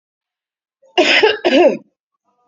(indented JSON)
{
  "cough_length": "2.5 s",
  "cough_amplitude": 30138,
  "cough_signal_mean_std_ratio": 0.45,
  "survey_phase": "beta (2021-08-13 to 2022-03-07)",
  "age": "45-64",
  "gender": "Female",
  "wearing_mask": "No",
  "symptom_abdominal_pain": true,
  "symptom_fatigue": true,
  "symptom_onset": "6 days",
  "smoker_status": "Ex-smoker",
  "respiratory_condition_asthma": false,
  "respiratory_condition_other": false,
  "recruitment_source": "REACT",
  "submission_delay": "2 days",
  "covid_test_result": "Negative",
  "covid_test_method": "RT-qPCR",
  "influenza_a_test_result": "Unknown/Void",
  "influenza_b_test_result": "Unknown/Void"
}